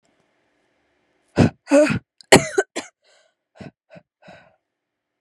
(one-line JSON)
{"exhalation_length": "5.2 s", "exhalation_amplitude": 32768, "exhalation_signal_mean_std_ratio": 0.25, "survey_phase": "beta (2021-08-13 to 2022-03-07)", "age": "18-44", "gender": "Female", "wearing_mask": "No", "symptom_cough_any": true, "symptom_runny_or_blocked_nose": true, "symptom_shortness_of_breath": true, "symptom_sore_throat": true, "symptom_abdominal_pain": true, "symptom_diarrhoea": true, "symptom_fatigue": true, "symptom_headache": true, "smoker_status": "Never smoked", "respiratory_condition_asthma": true, "respiratory_condition_other": false, "recruitment_source": "Test and Trace", "submission_delay": "2 days", "covid_test_result": "Positive", "covid_test_method": "RT-qPCR", "covid_ct_value": 25.7, "covid_ct_gene": "N gene"}